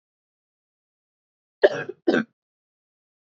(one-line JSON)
{"cough_length": "3.3 s", "cough_amplitude": 27304, "cough_signal_mean_std_ratio": 0.21, "survey_phase": "beta (2021-08-13 to 2022-03-07)", "age": "18-44", "gender": "Female", "wearing_mask": "No", "symptom_cough_any": true, "symptom_runny_or_blocked_nose": true, "symptom_fatigue": true, "smoker_status": "Never smoked", "respiratory_condition_asthma": false, "respiratory_condition_other": false, "recruitment_source": "Test and Trace", "submission_delay": "0 days", "covid_test_result": "Negative", "covid_test_method": "RT-qPCR"}